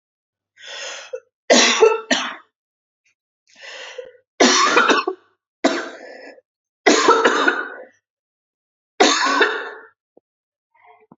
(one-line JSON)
{"three_cough_length": "11.2 s", "three_cough_amplitude": 32768, "three_cough_signal_mean_std_ratio": 0.43, "survey_phase": "alpha (2021-03-01 to 2021-08-12)", "age": "18-44", "gender": "Female", "wearing_mask": "No", "symptom_none": true, "smoker_status": "Never smoked", "respiratory_condition_asthma": false, "respiratory_condition_other": false, "recruitment_source": "REACT", "submission_delay": "1 day", "covid_test_result": "Negative", "covid_test_method": "RT-qPCR"}